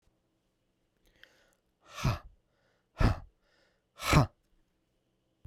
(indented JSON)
{
  "exhalation_length": "5.5 s",
  "exhalation_amplitude": 11423,
  "exhalation_signal_mean_std_ratio": 0.25,
  "survey_phase": "beta (2021-08-13 to 2022-03-07)",
  "age": "45-64",
  "gender": "Male",
  "wearing_mask": "No",
  "symptom_cough_any": true,
  "symptom_runny_or_blocked_nose": true,
  "symptom_sore_throat": true,
  "symptom_abdominal_pain": true,
  "symptom_fatigue": true,
  "symptom_headache": true,
  "smoker_status": "Ex-smoker",
  "respiratory_condition_asthma": false,
  "respiratory_condition_other": false,
  "recruitment_source": "Test and Trace",
  "submission_delay": "1 day",
  "covid_test_result": "Positive",
  "covid_test_method": "RT-qPCR",
  "covid_ct_value": 13.5,
  "covid_ct_gene": "S gene",
  "covid_ct_mean": 13.5,
  "covid_viral_load": "36000000 copies/ml",
  "covid_viral_load_category": "High viral load (>1M copies/ml)"
}